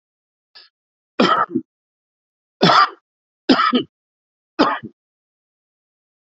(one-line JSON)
{"three_cough_length": "6.3 s", "three_cough_amplitude": 32767, "three_cough_signal_mean_std_ratio": 0.33, "survey_phase": "alpha (2021-03-01 to 2021-08-12)", "age": "45-64", "gender": "Male", "wearing_mask": "No", "symptom_fatigue": true, "symptom_onset": "4 days", "smoker_status": "Ex-smoker", "respiratory_condition_asthma": false, "respiratory_condition_other": false, "recruitment_source": "Test and Trace", "submission_delay": "2 days", "covid_test_result": "Positive", "covid_test_method": "RT-qPCR"}